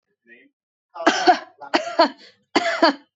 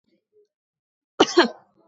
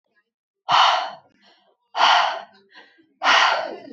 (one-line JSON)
{"three_cough_length": "3.2 s", "three_cough_amplitude": 25717, "three_cough_signal_mean_std_ratio": 0.41, "cough_length": "1.9 s", "cough_amplitude": 26069, "cough_signal_mean_std_ratio": 0.24, "exhalation_length": "3.9 s", "exhalation_amplitude": 22488, "exhalation_signal_mean_std_ratio": 0.48, "survey_phase": "beta (2021-08-13 to 2022-03-07)", "age": "18-44", "gender": "Female", "wearing_mask": "No", "symptom_shortness_of_breath": true, "symptom_fatigue": true, "symptom_onset": "11 days", "smoker_status": "Never smoked", "respiratory_condition_asthma": false, "respiratory_condition_other": false, "recruitment_source": "REACT", "submission_delay": "0 days", "covid_test_result": "Negative", "covid_test_method": "RT-qPCR", "influenza_a_test_result": "Negative", "influenza_b_test_result": "Negative"}